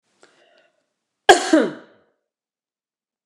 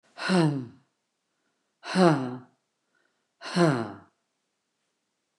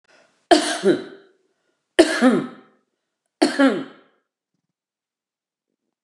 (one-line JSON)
{"cough_length": "3.3 s", "cough_amplitude": 29204, "cough_signal_mean_std_ratio": 0.23, "exhalation_length": "5.4 s", "exhalation_amplitude": 15723, "exhalation_signal_mean_std_ratio": 0.37, "three_cough_length": "6.0 s", "three_cough_amplitude": 29204, "three_cough_signal_mean_std_ratio": 0.33, "survey_phase": "beta (2021-08-13 to 2022-03-07)", "age": "65+", "gender": "Female", "wearing_mask": "No", "symptom_none": true, "smoker_status": "Ex-smoker", "respiratory_condition_asthma": false, "respiratory_condition_other": false, "recruitment_source": "REACT", "submission_delay": "1 day", "covid_test_result": "Negative", "covid_test_method": "RT-qPCR", "influenza_a_test_result": "Negative", "influenza_b_test_result": "Negative"}